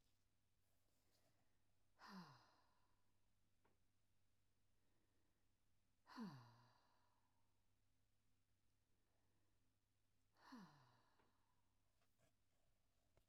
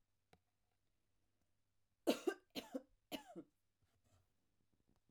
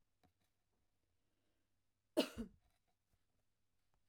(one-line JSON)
{"exhalation_length": "13.3 s", "exhalation_amplitude": 182, "exhalation_signal_mean_std_ratio": 0.46, "three_cough_length": "5.1 s", "three_cough_amplitude": 2608, "three_cough_signal_mean_std_ratio": 0.22, "cough_length": "4.1 s", "cough_amplitude": 2619, "cough_signal_mean_std_ratio": 0.17, "survey_phase": "beta (2021-08-13 to 2022-03-07)", "age": "45-64", "gender": "Female", "wearing_mask": "No", "symptom_none": true, "smoker_status": "Never smoked", "respiratory_condition_asthma": false, "respiratory_condition_other": false, "recruitment_source": "REACT", "submission_delay": "2 days", "covid_test_result": "Negative", "covid_test_method": "RT-qPCR", "influenza_a_test_result": "Negative", "influenza_b_test_result": "Negative"}